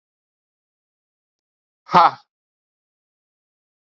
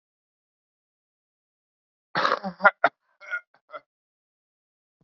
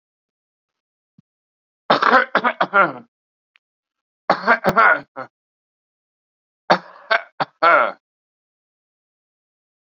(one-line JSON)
{"exhalation_length": "3.9 s", "exhalation_amplitude": 32768, "exhalation_signal_mean_std_ratio": 0.16, "cough_length": "5.0 s", "cough_amplitude": 27790, "cough_signal_mean_std_ratio": 0.2, "three_cough_length": "9.8 s", "three_cough_amplitude": 30242, "three_cough_signal_mean_std_ratio": 0.32, "survey_phase": "beta (2021-08-13 to 2022-03-07)", "age": "45-64", "gender": "Male", "wearing_mask": "No", "symptom_none": true, "smoker_status": "Current smoker (e-cigarettes or vapes only)", "respiratory_condition_asthma": false, "respiratory_condition_other": false, "recruitment_source": "REACT", "submission_delay": "1 day", "covid_test_result": "Negative", "covid_test_method": "RT-qPCR"}